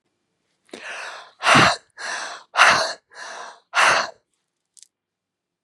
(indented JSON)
{
  "exhalation_length": "5.6 s",
  "exhalation_amplitude": 32525,
  "exhalation_signal_mean_std_ratio": 0.38,
  "survey_phase": "beta (2021-08-13 to 2022-03-07)",
  "age": "45-64",
  "gender": "Female",
  "wearing_mask": "No",
  "symptom_cough_any": true,
  "symptom_shortness_of_breath": true,
  "symptom_sore_throat": true,
  "symptom_abdominal_pain": true,
  "symptom_headache": true,
  "symptom_onset": "2 days",
  "smoker_status": "Ex-smoker",
  "respiratory_condition_asthma": false,
  "respiratory_condition_other": false,
  "recruitment_source": "Test and Trace",
  "submission_delay": "1 day",
  "covid_test_result": "Positive",
  "covid_test_method": "ePCR"
}